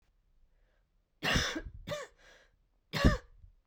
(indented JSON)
{
  "three_cough_length": "3.7 s",
  "three_cough_amplitude": 9329,
  "three_cough_signal_mean_std_ratio": 0.34,
  "survey_phase": "beta (2021-08-13 to 2022-03-07)",
  "age": "18-44",
  "gender": "Female",
  "wearing_mask": "No",
  "symptom_cough_any": true,
  "symptom_fatigue": true,
  "symptom_other": true,
  "symptom_onset": "7 days",
  "smoker_status": "Never smoked",
  "respiratory_condition_asthma": false,
  "respiratory_condition_other": false,
  "recruitment_source": "Test and Trace",
  "submission_delay": "1 day",
  "covid_test_result": "Negative",
  "covid_test_method": "RT-qPCR"
}